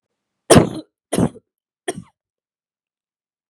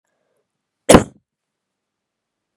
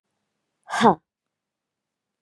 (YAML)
three_cough_length: 3.5 s
three_cough_amplitude: 32768
three_cough_signal_mean_std_ratio: 0.24
cough_length: 2.6 s
cough_amplitude: 32768
cough_signal_mean_std_ratio: 0.17
exhalation_length: 2.2 s
exhalation_amplitude: 26096
exhalation_signal_mean_std_ratio: 0.22
survey_phase: beta (2021-08-13 to 2022-03-07)
age: 18-44
gender: Female
wearing_mask: 'No'
symptom_none: true
symptom_onset: 13 days
smoker_status: Current smoker (1 to 10 cigarettes per day)
respiratory_condition_asthma: false
respiratory_condition_other: false
recruitment_source: REACT
submission_delay: 1 day
covid_test_result: Negative
covid_test_method: RT-qPCR
influenza_a_test_result: Negative
influenza_b_test_result: Negative